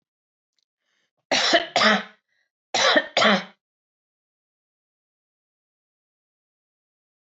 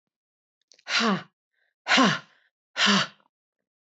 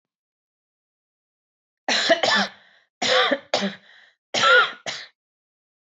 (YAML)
cough_length: 7.3 s
cough_amplitude: 19701
cough_signal_mean_std_ratio: 0.31
exhalation_length: 3.8 s
exhalation_amplitude: 15384
exhalation_signal_mean_std_ratio: 0.39
three_cough_length: 5.8 s
three_cough_amplitude: 17841
three_cough_signal_mean_std_ratio: 0.41
survey_phase: alpha (2021-03-01 to 2021-08-12)
age: 45-64
gender: Female
wearing_mask: 'No'
symptom_none: true
smoker_status: Never smoked
respiratory_condition_asthma: false
respiratory_condition_other: false
recruitment_source: REACT
submission_delay: 1 day
covid_test_result: Negative
covid_test_method: RT-qPCR